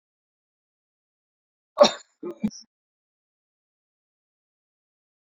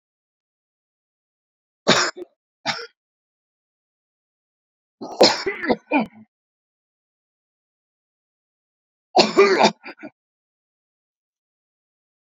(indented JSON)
{
  "cough_length": "5.2 s",
  "cough_amplitude": 27153,
  "cough_signal_mean_std_ratio": 0.14,
  "three_cough_length": "12.4 s",
  "three_cough_amplitude": 32146,
  "three_cough_signal_mean_std_ratio": 0.25,
  "survey_phase": "beta (2021-08-13 to 2022-03-07)",
  "age": "65+",
  "gender": "Male",
  "wearing_mask": "No",
  "symptom_cough_any": true,
  "symptom_shortness_of_breath": true,
  "smoker_status": "Ex-smoker",
  "respiratory_condition_asthma": false,
  "respiratory_condition_other": true,
  "recruitment_source": "REACT",
  "submission_delay": "1 day",
  "covid_test_result": "Negative",
  "covid_test_method": "RT-qPCR"
}